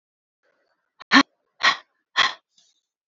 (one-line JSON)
{"exhalation_length": "3.1 s", "exhalation_amplitude": 30981, "exhalation_signal_mean_std_ratio": 0.25, "survey_phase": "beta (2021-08-13 to 2022-03-07)", "age": "18-44", "gender": "Female", "wearing_mask": "No", "symptom_cough_any": true, "symptom_runny_or_blocked_nose": true, "symptom_sore_throat": true, "symptom_fatigue": true, "symptom_change_to_sense_of_smell_or_taste": true, "symptom_onset": "3 days", "smoker_status": "Never smoked", "respiratory_condition_asthma": false, "respiratory_condition_other": false, "recruitment_source": "Test and Trace", "submission_delay": "2 days", "covid_test_result": "Positive", "covid_test_method": "RT-qPCR", "covid_ct_value": 23.3, "covid_ct_gene": "N gene"}